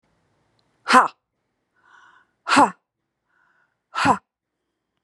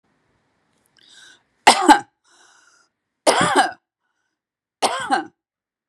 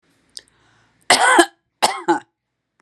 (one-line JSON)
{"exhalation_length": "5.0 s", "exhalation_amplitude": 32703, "exhalation_signal_mean_std_ratio": 0.26, "three_cough_length": "5.9 s", "three_cough_amplitude": 32768, "three_cough_signal_mean_std_ratio": 0.3, "cough_length": "2.8 s", "cough_amplitude": 32768, "cough_signal_mean_std_ratio": 0.35, "survey_phase": "beta (2021-08-13 to 2022-03-07)", "age": "45-64", "gender": "Female", "wearing_mask": "No", "symptom_fatigue": true, "symptom_headache": true, "symptom_onset": "5 days", "smoker_status": "Never smoked", "respiratory_condition_asthma": false, "respiratory_condition_other": false, "recruitment_source": "REACT", "submission_delay": "0 days", "covid_test_result": "Negative", "covid_test_method": "RT-qPCR", "influenza_a_test_result": "Negative", "influenza_b_test_result": "Negative"}